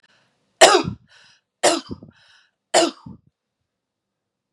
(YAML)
three_cough_length: 4.5 s
three_cough_amplitude: 32768
three_cough_signal_mean_std_ratio: 0.27
survey_phase: beta (2021-08-13 to 2022-03-07)
age: 45-64
gender: Female
wearing_mask: 'No'
symptom_none: true
smoker_status: Never smoked
respiratory_condition_asthma: false
respiratory_condition_other: false
recruitment_source: REACT
submission_delay: 2 days
covid_test_result: Negative
covid_test_method: RT-qPCR
influenza_a_test_result: Negative
influenza_b_test_result: Negative